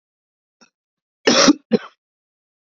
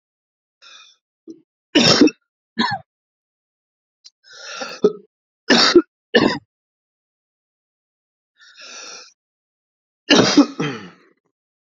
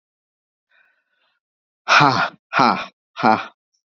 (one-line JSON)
{"cough_length": "2.6 s", "cough_amplitude": 29724, "cough_signal_mean_std_ratio": 0.28, "three_cough_length": "11.6 s", "three_cough_amplitude": 32768, "three_cough_signal_mean_std_ratio": 0.3, "exhalation_length": "3.8 s", "exhalation_amplitude": 31686, "exhalation_signal_mean_std_ratio": 0.35, "survey_phase": "beta (2021-08-13 to 2022-03-07)", "age": "18-44", "gender": "Male", "wearing_mask": "No", "symptom_cough_any": true, "symptom_new_continuous_cough": true, "symptom_runny_or_blocked_nose": true, "symptom_shortness_of_breath": true, "symptom_sore_throat": true, "symptom_fatigue": true, "symptom_fever_high_temperature": true, "symptom_headache": true, "symptom_change_to_sense_of_smell_or_taste": true, "symptom_loss_of_taste": true, "symptom_other": true, "smoker_status": "Prefer not to say", "recruitment_source": "Test and Trace", "submission_delay": "2 days", "covid_test_result": "Positive", "covid_test_method": "LFT"}